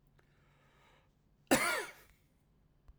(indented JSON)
{
  "cough_length": "3.0 s",
  "cough_amplitude": 7345,
  "cough_signal_mean_std_ratio": 0.27,
  "survey_phase": "alpha (2021-03-01 to 2021-08-12)",
  "age": "18-44",
  "gender": "Male",
  "wearing_mask": "No",
  "symptom_cough_any": true,
  "symptom_change_to_sense_of_smell_or_taste": true,
  "smoker_status": "Never smoked",
  "respiratory_condition_asthma": false,
  "respiratory_condition_other": false,
  "recruitment_source": "Test and Trace",
  "submission_delay": "2 days",
  "covid_test_result": "Positive",
  "covid_test_method": "RT-qPCR",
  "covid_ct_value": 22.6,
  "covid_ct_gene": "ORF1ab gene"
}